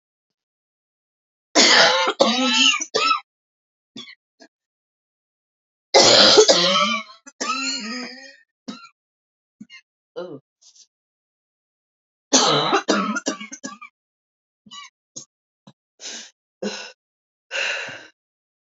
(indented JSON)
{
  "three_cough_length": "18.6 s",
  "three_cough_amplitude": 32736,
  "three_cough_signal_mean_std_ratio": 0.38,
  "survey_phase": "beta (2021-08-13 to 2022-03-07)",
  "age": "18-44",
  "gender": "Female",
  "wearing_mask": "No",
  "symptom_cough_any": true,
  "symptom_shortness_of_breath": true,
  "symptom_sore_throat": true,
  "symptom_fatigue": true,
  "smoker_status": "Never smoked",
  "respiratory_condition_asthma": false,
  "respiratory_condition_other": false,
  "recruitment_source": "Test and Trace",
  "submission_delay": "2 days",
  "covid_test_result": "Positive",
  "covid_test_method": "RT-qPCR",
  "covid_ct_value": 20.1,
  "covid_ct_gene": "ORF1ab gene",
  "covid_ct_mean": 20.5,
  "covid_viral_load": "190000 copies/ml",
  "covid_viral_load_category": "Low viral load (10K-1M copies/ml)"
}